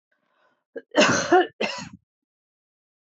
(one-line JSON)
{"cough_length": "3.1 s", "cough_amplitude": 18076, "cough_signal_mean_std_ratio": 0.35, "survey_phase": "beta (2021-08-13 to 2022-03-07)", "age": "45-64", "gender": "Female", "wearing_mask": "No", "symptom_none": true, "smoker_status": "Ex-smoker", "respiratory_condition_asthma": false, "respiratory_condition_other": false, "recruitment_source": "REACT", "submission_delay": "1 day", "covid_test_result": "Negative", "covid_test_method": "RT-qPCR", "influenza_a_test_result": "Negative", "influenza_b_test_result": "Negative"}